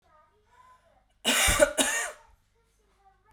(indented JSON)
{
  "cough_length": "3.3 s",
  "cough_amplitude": 16097,
  "cough_signal_mean_std_ratio": 0.38,
  "survey_phase": "beta (2021-08-13 to 2022-03-07)",
  "age": "18-44",
  "gender": "Female",
  "wearing_mask": "No",
  "symptom_runny_or_blocked_nose": true,
  "symptom_sore_throat": true,
  "symptom_fatigue": true,
  "symptom_headache": true,
  "symptom_change_to_sense_of_smell_or_taste": true,
  "symptom_loss_of_taste": true,
  "symptom_onset": "3 days",
  "smoker_status": "Never smoked",
  "respiratory_condition_asthma": false,
  "respiratory_condition_other": false,
  "recruitment_source": "Test and Trace",
  "submission_delay": "1 day",
  "covid_test_result": "Positive",
  "covid_test_method": "RT-qPCR",
  "covid_ct_value": 17.1,
  "covid_ct_gene": "ORF1ab gene",
  "covid_ct_mean": 17.4,
  "covid_viral_load": "2000000 copies/ml",
  "covid_viral_load_category": "High viral load (>1M copies/ml)"
}